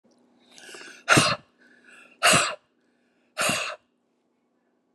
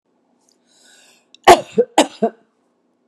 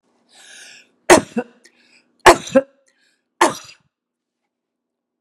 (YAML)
exhalation_length: 4.9 s
exhalation_amplitude: 23569
exhalation_signal_mean_std_ratio: 0.34
cough_length: 3.1 s
cough_amplitude: 32768
cough_signal_mean_std_ratio: 0.24
three_cough_length: 5.2 s
three_cough_amplitude: 32768
three_cough_signal_mean_std_ratio: 0.22
survey_phase: beta (2021-08-13 to 2022-03-07)
age: 65+
gender: Female
wearing_mask: 'No'
symptom_none: true
smoker_status: Ex-smoker
respiratory_condition_asthma: false
respiratory_condition_other: false
recruitment_source: Test and Trace
submission_delay: 0 days
covid_test_result: Negative
covid_test_method: LFT